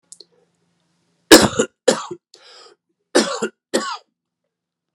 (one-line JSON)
{"cough_length": "4.9 s", "cough_amplitude": 32768, "cough_signal_mean_std_ratio": 0.27, "survey_phase": "beta (2021-08-13 to 2022-03-07)", "age": "45-64", "gender": "Male", "wearing_mask": "No", "symptom_cough_any": true, "symptom_new_continuous_cough": true, "symptom_runny_or_blocked_nose": true, "symptom_shortness_of_breath": true, "symptom_fatigue": true, "symptom_headache": true, "smoker_status": "Never smoked", "respiratory_condition_asthma": false, "respiratory_condition_other": false, "recruitment_source": "Test and Trace", "submission_delay": "0 days", "covid_test_result": "Positive", "covid_test_method": "LFT"}